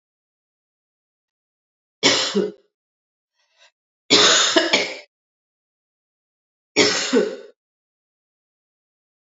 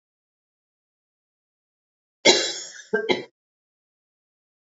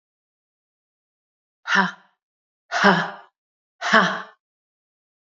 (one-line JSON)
{"three_cough_length": "9.2 s", "three_cough_amplitude": 28967, "three_cough_signal_mean_std_ratio": 0.34, "cough_length": "4.8 s", "cough_amplitude": 26412, "cough_signal_mean_std_ratio": 0.24, "exhalation_length": "5.4 s", "exhalation_amplitude": 29243, "exhalation_signal_mean_std_ratio": 0.3, "survey_phase": "alpha (2021-03-01 to 2021-08-12)", "age": "45-64", "gender": "Female", "wearing_mask": "No", "symptom_new_continuous_cough": true, "symptom_fatigue": true, "symptom_fever_high_temperature": true, "symptom_headache": true, "symptom_onset": "5 days", "smoker_status": "Ex-smoker", "respiratory_condition_asthma": false, "respiratory_condition_other": false, "recruitment_source": "Test and Trace", "submission_delay": "1 day", "covid_test_result": "Positive", "covid_test_method": "RT-qPCR"}